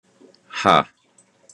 {"exhalation_length": "1.5 s", "exhalation_amplitude": 32767, "exhalation_signal_mean_std_ratio": 0.28, "survey_phase": "beta (2021-08-13 to 2022-03-07)", "age": "18-44", "gender": "Male", "wearing_mask": "No", "symptom_none": true, "smoker_status": "Never smoked", "respiratory_condition_asthma": true, "respiratory_condition_other": false, "recruitment_source": "REACT", "submission_delay": "0 days", "covid_test_result": "Negative", "covid_test_method": "RT-qPCR", "influenza_a_test_result": "Unknown/Void", "influenza_b_test_result": "Unknown/Void"}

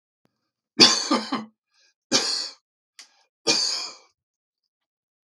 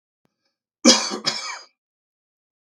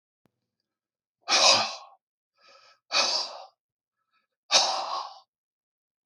{"three_cough_length": "5.4 s", "three_cough_amplitude": 32766, "three_cough_signal_mean_std_ratio": 0.33, "cough_length": "2.6 s", "cough_amplitude": 32768, "cough_signal_mean_std_ratio": 0.28, "exhalation_length": "6.1 s", "exhalation_amplitude": 20908, "exhalation_signal_mean_std_ratio": 0.35, "survey_phase": "beta (2021-08-13 to 2022-03-07)", "age": "65+", "gender": "Male", "wearing_mask": "No", "symptom_fever_high_temperature": true, "symptom_headache": true, "symptom_onset": "3 days", "smoker_status": "Ex-smoker", "respiratory_condition_asthma": false, "respiratory_condition_other": false, "recruitment_source": "REACT", "submission_delay": "1 day", "covid_test_result": "Negative", "covid_test_method": "RT-qPCR", "influenza_a_test_result": "Negative", "influenza_b_test_result": "Negative"}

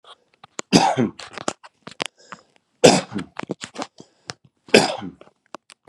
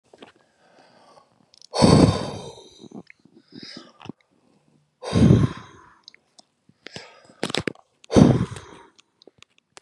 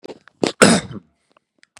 {"three_cough_length": "5.9 s", "three_cough_amplitude": 32768, "three_cough_signal_mean_std_ratio": 0.29, "exhalation_length": "9.8 s", "exhalation_amplitude": 31969, "exhalation_signal_mean_std_ratio": 0.3, "cough_length": "1.8 s", "cough_amplitude": 32768, "cough_signal_mean_std_ratio": 0.3, "survey_phase": "beta (2021-08-13 to 2022-03-07)", "age": "45-64", "gender": "Male", "wearing_mask": "No", "symptom_none": true, "smoker_status": "Ex-smoker", "respiratory_condition_asthma": false, "respiratory_condition_other": false, "recruitment_source": "REACT", "submission_delay": "1 day", "covid_test_result": "Negative", "covid_test_method": "RT-qPCR", "influenza_a_test_result": "Negative", "influenza_b_test_result": "Negative"}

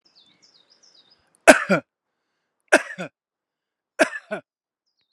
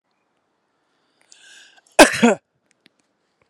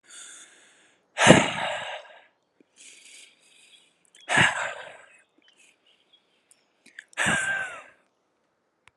{"three_cough_length": "5.1 s", "three_cough_amplitude": 32768, "three_cough_signal_mean_std_ratio": 0.2, "cough_length": "3.5 s", "cough_amplitude": 32768, "cough_signal_mean_std_ratio": 0.21, "exhalation_length": "9.0 s", "exhalation_amplitude": 32768, "exhalation_signal_mean_std_ratio": 0.3, "survey_phase": "alpha (2021-03-01 to 2021-08-12)", "age": "45-64", "gender": "Male", "wearing_mask": "No", "symptom_none": true, "smoker_status": "Never smoked", "respiratory_condition_asthma": false, "respiratory_condition_other": false, "recruitment_source": "REACT", "submission_delay": "2 days", "covid_test_result": "Negative", "covid_test_method": "RT-qPCR"}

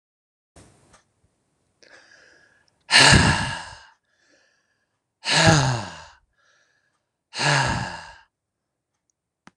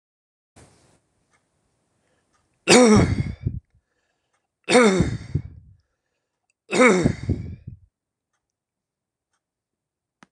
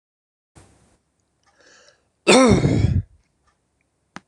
{"exhalation_length": "9.6 s", "exhalation_amplitude": 26027, "exhalation_signal_mean_std_ratio": 0.33, "three_cough_length": "10.3 s", "three_cough_amplitude": 26027, "three_cough_signal_mean_std_ratio": 0.32, "cough_length": "4.3 s", "cough_amplitude": 26027, "cough_signal_mean_std_ratio": 0.32, "survey_phase": "beta (2021-08-13 to 2022-03-07)", "age": "45-64", "gender": "Male", "wearing_mask": "No", "symptom_none": true, "smoker_status": "Never smoked", "respiratory_condition_asthma": false, "respiratory_condition_other": false, "recruitment_source": "REACT", "submission_delay": "1 day", "covid_test_result": "Negative", "covid_test_method": "RT-qPCR", "influenza_a_test_result": "Negative", "influenza_b_test_result": "Negative"}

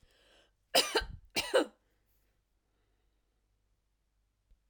{"cough_length": "4.7 s", "cough_amplitude": 8729, "cough_signal_mean_std_ratio": 0.25, "survey_phase": "alpha (2021-03-01 to 2021-08-12)", "age": "65+", "gender": "Female", "wearing_mask": "No", "symptom_none": true, "smoker_status": "Never smoked", "respiratory_condition_asthma": false, "respiratory_condition_other": false, "recruitment_source": "REACT", "submission_delay": "2 days", "covid_test_result": "Negative", "covid_test_method": "RT-qPCR"}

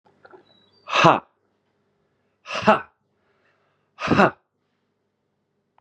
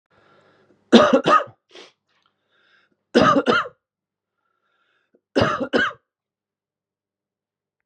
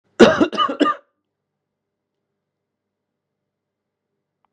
{"exhalation_length": "5.8 s", "exhalation_amplitude": 32470, "exhalation_signal_mean_std_ratio": 0.26, "three_cough_length": "7.9 s", "three_cough_amplitude": 32767, "three_cough_signal_mean_std_ratio": 0.32, "cough_length": "4.5 s", "cough_amplitude": 32768, "cough_signal_mean_std_ratio": 0.25, "survey_phase": "beta (2021-08-13 to 2022-03-07)", "age": "45-64", "gender": "Male", "wearing_mask": "No", "symptom_cough_any": true, "symptom_runny_or_blocked_nose": true, "symptom_loss_of_taste": true, "symptom_onset": "7 days", "smoker_status": "Ex-smoker", "respiratory_condition_asthma": false, "respiratory_condition_other": false, "recruitment_source": "Test and Trace", "submission_delay": "2 days", "covid_test_result": "Negative", "covid_test_method": "ePCR"}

